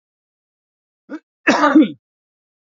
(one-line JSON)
{"cough_length": "2.6 s", "cough_amplitude": 28274, "cough_signal_mean_std_ratio": 0.32, "survey_phase": "beta (2021-08-13 to 2022-03-07)", "age": "18-44", "gender": "Male", "wearing_mask": "No", "symptom_none": true, "smoker_status": "Ex-smoker", "respiratory_condition_asthma": false, "respiratory_condition_other": false, "recruitment_source": "REACT", "submission_delay": "2 days", "covid_test_result": "Negative", "covid_test_method": "RT-qPCR", "influenza_a_test_result": "Negative", "influenza_b_test_result": "Negative"}